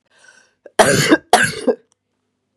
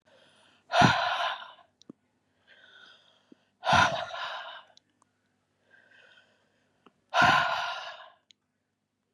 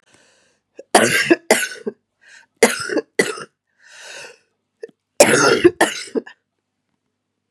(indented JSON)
{
  "cough_length": "2.6 s",
  "cough_amplitude": 32768,
  "cough_signal_mean_std_ratio": 0.4,
  "exhalation_length": "9.1 s",
  "exhalation_amplitude": 15091,
  "exhalation_signal_mean_std_ratio": 0.35,
  "three_cough_length": "7.5 s",
  "three_cough_amplitude": 32768,
  "three_cough_signal_mean_std_ratio": 0.36,
  "survey_phase": "beta (2021-08-13 to 2022-03-07)",
  "age": "45-64",
  "gender": "Female",
  "wearing_mask": "No",
  "symptom_cough_any": true,
  "symptom_new_continuous_cough": true,
  "symptom_runny_or_blocked_nose": true,
  "symptom_headache": true,
  "symptom_onset": "2 days",
  "smoker_status": "Current smoker (1 to 10 cigarettes per day)",
  "respiratory_condition_asthma": true,
  "respiratory_condition_other": false,
  "recruitment_source": "Test and Trace",
  "submission_delay": "2 days",
  "covid_test_result": "Negative",
  "covid_test_method": "RT-qPCR"
}